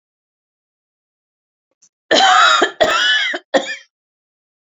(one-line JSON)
{"three_cough_length": "4.7 s", "three_cough_amplitude": 30075, "three_cough_signal_mean_std_ratio": 0.43, "survey_phase": "beta (2021-08-13 to 2022-03-07)", "age": "65+", "gender": "Female", "wearing_mask": "No", "symptom_none": true, "smoker_status": "Never smoked", "respiratory_condition_asthma": false, "respiratory_condition_other": true, "recruitment_source": "REACT", "submission_delay": "34 days", "covid_test_result": "Negative", "covid_test_method": "RT-qPCR", "influenza_a_test_result": "Unknown/Void", "influenza_b_test_result": "Unknown/Void"}